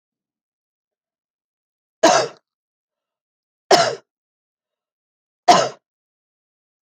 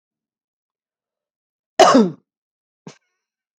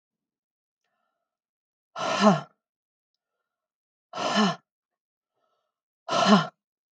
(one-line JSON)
{"three_cough_length": "6.8 s", "three_cough_amplitude": 32767, "three_cough_signal_mean_std_ratio": 0.23, "cough_length": "3.6 s", "cough_amplitude": 32767, "cough_signal_mean_std_ratio": 0.23, "exhalation_length": "6.9 s", "exhalation_amplitude": 20729, "exhalation_signal_mean_std_ratio": 0.3, "survey_phase": "beta (2021-08-13 to 2022-03-07)", "age": "18-44", "gender": "Female", "wearing_mask": "No", "symptom_none": true, "smoker_status": "Ex-smoker", "respiratory_condition_asthma": false, "respiratory_condition_other": false, "recruitment_source": "REACT", "submission_delay": "1 day", "covid_test_result": "Negative", "covid_test_method": "RT-qPCR", "influenza_a_test_result": "Unknown/Void", "influenza_b_test_result": "Unknown/Void"}